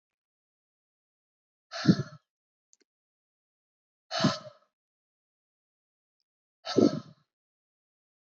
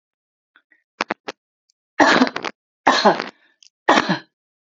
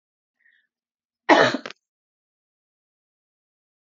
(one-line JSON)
{"exhalation_length": "8.4 s", "exhalation_amplitude": 12406, "exhalation_signal_mean_std_ratio": 0.2, "three_cough_length": "4.6 s", "three_cough_amplitude": 30201, "three_cough_signal_mean_std_ratio": 0.35, "cough_length": "3.9 s", "cough_amplitude": 27072, "cough_signal_mean_std_ratio": 0.2, "survey_phase": "beta (2021-08-13 to 2022-03-07)", "age": "45-64", "gender": "Female", "wearing_mask": "No", "symptom_none": true, "smoker_status": "Never smoked", "respiratory_condition_asthma": false, "respiratory_condition_other": false, "recruitment_source": "REACT", "submission_delay": "1 day", "covid_test_result": "Negative", "covid_test_method": "RT-qPCR"}